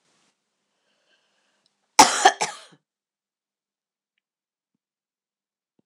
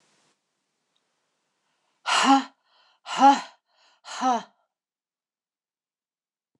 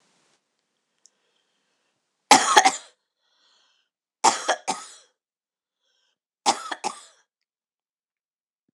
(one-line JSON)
{"cough_length": "5.9 s", "cough_amplitude": 26028, "cough_signal_mean_std_ratio": 0.16, "exhalation_length": "6.6 s", "exhalation_amplitude": 18431, "exhalation_signal_mean_std_ratio": 0.27, "three_cough_length": "8.7 s", "three_cough_amplitude": 26028, "three_cough_signal_mean_std_ratio": 0.22, "survey_phase": "beta (2021-08-13 to 2022-03-07)", "age": "45-64", "gender": "Female", "wearing_mask": "No", "symptom_headache": true, "symptom_other": true, "smoker_status": "Never smoked", "respiratory_condition_asthma": false, "respiratory_condition_other": false, "recruitment_source": "Test and Trace", "submission_delay": "2 days", "covid_test_result": "Positive", "covid_test_method": "ePCR"}